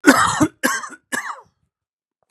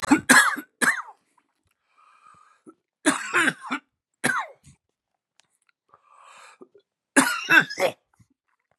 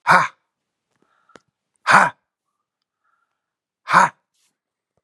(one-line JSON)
{"cough_length": "2.3 s", "cough_amplitude": 32768, "cough_signal_mean_std_ratio": 0.41, "three_cough_length": "8.8 s", "three_cough_amplitude": 29858, "three_cough_signal_mean_std_ratio": 0.33, "exhalation_length": "5.0 s", "exhalation_amplitude": 32767, "exhalation_signal_mean_std_ratio": 0.26, "survey_phase": "beta (2021-08-13 to 2022-03-07)", "age": "65+", "gender": "Male", "wearing_mask": "No", "symptom_cough_any": true, "symptom_fatigue": true, "symptom_onset": "12 days", "smoker_status": "Ex-smoker", "respiratory_condition_asthma": false, "respiratory_condition_other": false, "recruitment_source": "REACT", "submission_delay": "2 days", "covid_test_result": "Negative", "covid_test_method": "RT-qPCR", "influenza_a_test_result": "Negative", "influenza_b_test_result": "Negative"}